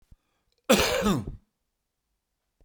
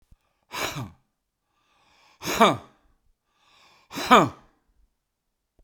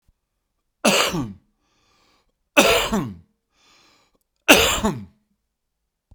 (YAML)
cough_length: 2.6 s
cough_amplitude: 19323
cough_signal_mean_std_ratio: 0.36
exhalation_length: 5.6 s
exhalation_amplitude: 28208
exhalation_signal_mean_std_ratio: 0.25
three_cough_length: 6.1 s
three_cough_amplitude: 32768
three_cough_signal_mean_std_ratio: 0.34
survey_phase: beta (2021-08-13 to 2022-03-07)
age: 65+
gender: Male
wearing_mask: 'No'
symptom_cough_any: true
symptom_diarrhoea: true
symptom_fatigue: true
symptom_fever_high_temperature: true
symptom_onset: 6 days
smoker_status: Ex-smoker
respiratory_condition_asthma: false
respiratory_condition_other: false
recruitment_source: Test and Trace
submission_delay: 1 day
covid_test_result: Positive
covid_test_method: RT-qPCR
covid_ct_value: 19.5
covid_ct_gene: ORF1ab gene
covid_ct_mean: 20.3
covid_viral_load: 220000 copies/ml
covid_viral_load_category: Low viral load (10K-1M copies/ml)